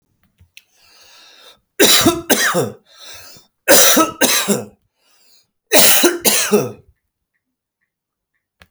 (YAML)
three_cough_length: 8.7 s
three_cough_amplitude: 32768
three_cough_signal_mean_std_ratio: 0.43
survey_phase: beta (2021-08-13 to 2022-03-07)
age: 45-64
gender: Male
wearing_mask: 'No'
symptom_none: true
smoker_status: Ex-smoker
respiratory_condition_asthma: false
respiratory_condition_other: false
recruitment_source: REACT
submission_delay: 0 days
covid_test_result: Negative
covid_test_method: RT-qPCR